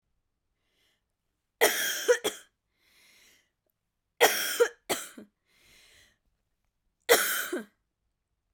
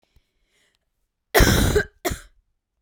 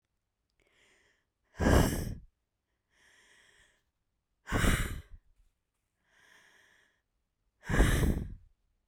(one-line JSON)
{"three_cough_length": "8.5 s", "three_cough_amplitude": 17172, "three_cough_signal_mean_std_ratio": 0.31, "cough_length": "2.8 s", "cough_amplitude": 29792, "cough_signal_mean_std_ratio": 0.36, "exhalation_length": "8.9 s", "exhalation_amplitude": 9443, "exhalation_signal_mean_std_ratio": 0.33, "survey_phase": "beta (2021-08-13 to 2022-03-07)", "age": "18-44", "gender": "Female", "wearing_mask": "No", "symptom_cough_any": true, "symptom_new_continuous_cough": true, "symptom_sore_throat": true, "symptom_fatigue": true, "symptom_fever_high_temperature": true, "symptom_onset": "3 days", "smoker_status": "Never smoked", "respiratory_condition_asthma": false, "respiratory_condition_other": false, "recruitment_source": "Test and Trace", "submission_delay": "2 days", "covid_test_result": "Positive", "covid_test_method": "RT-qPCR", "covid_ct_value": 22.7, "covid_ct_gene": "ORF1ab gene", "covid_ct_mean": 22.9, "covid_viral_load": "31000 copies/ml", "covid_viral_load_category": "Low viral load (10K-1M copies/ml)"}